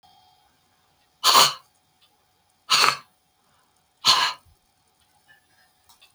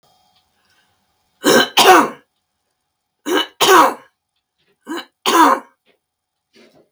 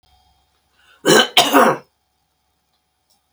{"exhalation_length": "6.1 s", "exhalation_amplitude": 32766, "exhalation_signal_mean_std_ratio": 0.28, "three_cough_length": "6.9 s", "three_cough_amplitude": 32768, "three_cough_signal_mean_std_ratio": 0.36, "cough_length": "3.3 s", "cough_amplitude": 32768, "cough_signal_mean_std_ratio": 0.33, "survey_phase": "beta (2021-08-13 to 2022-03-07)", "age": "65+", "gender": "Female", "wearing_mask": "No", "symptom_none": true, "smoker_status": "Never smoked", "respiratory_condition_asthma": true, "respiratory_condition_other": false, "recruitment_source": "REACT", "submission_delay": "2 days", "covid_test_result": "Negative", "covid_test_method": "RT-qPCR", "influenza_a_test_result": "Negative", "influenza_b_test_result": "Negative"}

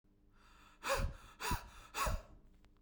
{"exhalation_length": "2.8 s", "exhalation_amplitude": 2169, "exhalation_signal_mean_std_ratio": 0.5, "survey_phase": "beta (2021-08-13 to 2022-03-07)", "age": "45-64", "gender": "Male", "wearing_mask": "No", "symptom_none": true, "smoker_status": "Never smoked", "respiratory_condition_asthma": false, "respiratory_condition_other": false, "recruitment_source": "REACT", "submission_delay": "1 day", "covid_test_result": "Negative", "covid_test_method": "RT-qPCR"}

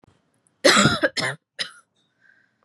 {"three_cough_length": "2.6 s", "three_cough_amplitude": 27302, "three_cough_signal_mean_std_ratio": 0.36, "survey_phase": "beta (2021-08-13 to 2022-03-07)", "age": "18-44", "gender": "Female", "wearing_mask": "No", "symptom_headache": true, "smoker_status": "Never smoked", "respiratory_condition_asthma": false, "respiratory_condition_other": false, "recruitment_source": "REACT", "submission_delay": "1 day", "covid_test_result": "Negative", "covid_test_method": "RT-qPCR", "influenza_a_test_result": "Negative", "influenza_b_test_result": "Negative"}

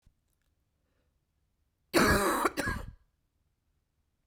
{"cough_length": "4.3 s", "cough_amplitude": 9414, "cough_signal_mean_std_ratio": 0.34, "survey_phase": "beta (2021-08-13 to 2022-03-07)", "age": "18-44", "gender": "Female", "wearing_mask": "No", "symptom_runny_or_blocked_nose": true, "symptom_shortness_of_breath": true, "symptom_fatigue": true, "symptom_headache": true, "symptom_change_to_sense_of_smell_or_taste": true, "symptom_loss_of_taste": true, "symptom_onset": "6 days", "smoker_status": "Never smoked", "respiratory_condition_asthma": false, "respiratory_condition_other": false, "recruitment_source": "Test and Trace", "submission_delay": "2 days", "covid_test_result": "Positive", "covid_test_method": "RT-qPCR", "covid_ct_value": 15.4, "covid_ct_gene": "ORF1ab gene", "covid_ct_mean": 16.5, "covid_viral_load": "3800000 copies/ml", "covid_viral_load_category": "High viral load (>1M copies/ml)"}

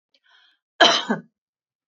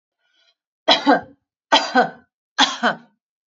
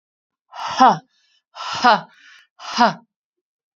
{"cough_length": "1.9 s", "cough_amplitude": 28885, "cough_signal_mean_std_ratio": 0.29, "three_cough_length": "3.5 s", "three_cough_amplitude": 32577, "three_cough_signal_mean_std_ratio": 0.37, "exhalation_length": "3.8 s", "exhalation_amplitude": 29033, "exhalation_signal_mean_std_ratio": 0.34, "survey_phase": "alpha (2021-03-01 to 2021-08-12)", "age": "45-64", "gender": "Female", "wearing_mask": "No", "symptom_none": true, "smoker_status": "Never smoked", "respiratory_condition_asthma": false, "respiratory_condition_other": false, "recruitment_source": "REACT", "submission_delay": "2 days", "covid_test_result": "Negative", "covid_test_method": "RT-qPCR"}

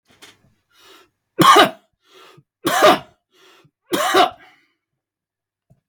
{"three_cough_length": "5.9 s", "three_cough_amplitude": 32768, "three_cough_signal_mean_std_ratio": 0.32, "survey_phase": "beta (2021-08-13 to 2022-03-07)", "age": "45-64", "gender": "Male", "wearing_mask": "No", "symptom_none": true, "smoker_status": "Never smoked", "respiratory_condition_asthma": false, "respiratory_condition_other": false, "recruitment_source": "REACT", "submission_delay": "1 day", "covid_test_result": "Negative", "covid_test_method": "RT-qPCR", "influenza_a_test_result": "Negative", "influenza_b_test_result": "Negative"}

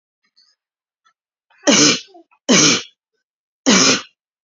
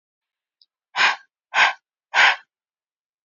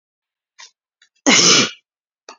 {"three_cough_length": "4.4 s", "three_cough_amplitude": 32767, "three_cough_signal_mean_std_ratio": 0.39, "exhalation_length": "3.2 s", "exhalation_amplitude": 26387, "exhalation_signal_mean_std_ratio": 0.33, "cough_length": "2.4 s", "cough_amplitude": 32768, "cough_signal_mean_std_ratio": 0.35, "survey_phase": "beta (2021-08-13 to 2022-03-07)", "age": "18-44", "gender": "Female", "wearing_mask": "No", "symptom_new_continuous_cough": true, "symptom_sore_throat": true, "symptom_fatigue": true, "symptom_headache": true, "symptom_onset": "5 days", "smoker_status": "Ex-smoker", "respiratory_condition_asthma": false, "respiratory_condition_other": false, "recruitment_source": "Test and Trace", "submission_delay": "2 days", "covid_test_result": "Positive", "covid_test_method": "RT-qPCR", "covid_ct_value": 38.2, "covid_ct_gene": "N gene"}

